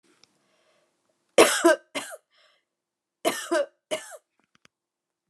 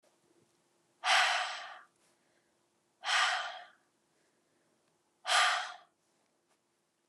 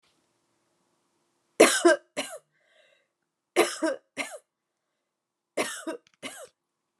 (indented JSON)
{
  "cough_length": "5.3 s",
  "cough_amplitude": 26645,
  "cough_signal_mean_std_ratio": 0.27,
  "exhalation_length": "7.1 s",
  "exhalation_amplitude": 5750,
  "exhalation_signal_mean_std_ratio": 0.36,
  "three_cough_length": "7.0 s",
  "three_cough_amplitude": 26226,
  "three_cough_signal_mean_std_ratio": 0.26,
  "survey_phase": "alpha (2021-03-01 to 2021-08-12)",
  "age": "18-44",
  "gender": "Female",
  "wearing_mask": "No",
  "symptom_none": true,
  "smoker_status": "Ex-smoker",
  "respiratory_condition_asthma": false,
  "respiratory_condition_other": false,
  "recruitment_source": "REACT",
  "submission_delay": "2 days",
  "covid_test_result": "Negative",
  "covid_test_method": "RT-qPCR"
}